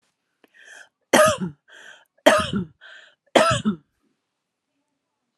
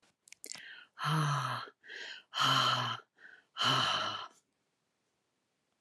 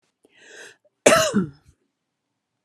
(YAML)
three_cough_length: 5.4 s
three_cough_amplitude: 32319
three_cough_signal_mean_std_ratio: 0.33
exhalation_length: 5.8 s
exhalation_amplitude: 5297
exhalation_signal_mean_std_ratio: 0.52
cough_length: 2.6 s
cough_amplitude: 32721
cough_signal_mean_std_ratio: 0.3
survey_phase: alpha (2021-03-01 to 2021-08-12)
age: 45-64
gender: Female
wearing_mask: 'No'
symptom_none: true
smoker_status: Ex-smoker
respiratory_condition_asthma: false
respiratory_condition_other: false
recruitment_source: REACT
submission_delay: 2 days
covid_test_result: Negative
covid_test_method: RT-qPCR